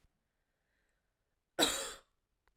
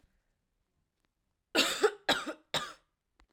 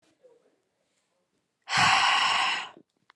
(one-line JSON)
{"cough_length": "2.6 s", "cough_amplitude": 5323, "cough_signal_mean_std_ratio": 0.25, "three_cough_length": "3.3 s", "three_cough_amplitude": 8233, "three_cough_signal_mean_std_ratio": 0.32, "exhalation_length": "3.2 s", "exhalation_amplitude": 12059, "exhalation_signal_mean_std_ratio": 0.46, "survey_phase": "alpha (2021-03-01 to 2021-08-12)", "age": "18-44", "gender": "Female", "wearing_mask": "No", "symptom_cough_any": true, "symptom_headache": true, "smoker_status": "Never smoked", "respiratory_condition_asthma": false, "respiratory_condition_other": false, "recruitment_source": "Test and Trace", "submission_delay": "1 day", "covid_test_result": "Positive", "covid_test_method": "RT-qPCR", "covid_ct_value": 22.6, "covid_ct_gene": "ORF1ab gene"}